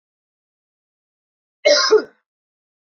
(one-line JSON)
{"cough_length": "3.0 s", "cough_amplitude": 26668, "cough_signal_mean_std_ratio": 0.27, "survey_phase": "alpha (2021-03-01 to 2021-08-12)", "age": "45-64", "gender": "Female", "wearing_mask": "No", "symptom_cough_any": true, "symptom_fatigue": true, "smoker_status": "Ex-smoker", "respiratory_condition_asthma": false, "respiratory_condition_other": false, "recruitment_source": "Test and Trace", "submission_delay": "2 days", "covid_test_result": "Positive", "covid_test_method": "RT-qPCR", "covid_ct_value": 16.4, "covid_ct_gene": "ORF1ab gene", "covid_ct_mean": 18.0, "covid_viral_load": "1200000 copies/ml", "covid_viral_load_category": "High viral load (>1M copies/ml)"}